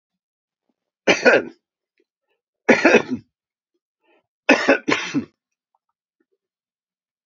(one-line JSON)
{"three_cough_length": "7.3 s", "three_cough_amplitude": 32768, "three_cough_signal_mean_std_ratio": 0.3, "survey_phase": "beta (2021-08-13 to 2022-03-07)", "age": "65+", "gender": "Male", "wearing_mask": "No", "symptom_cough_any": true, "symptom_runny_or_blocked_nose": true, "symptom_onset": "5 days", "smoker_status": "Never smoked", "respiratory_condition_asthma": false, "respiratory_condition_other": false, "recruitment_source": "Test and Trace", "submission_delay": "1 day", "covid_test_result": "Positive", "covid_test_method": "RT-qPCR", "covid_ct_value": 14.6, "covid_ct_gene": "ORF1ab gene", "covid_ct_mean": 15.7, "covid_viral_load": "7000000 copies/ml", "covid_viral_load_category": "High viral load (>1M copies/ml)"}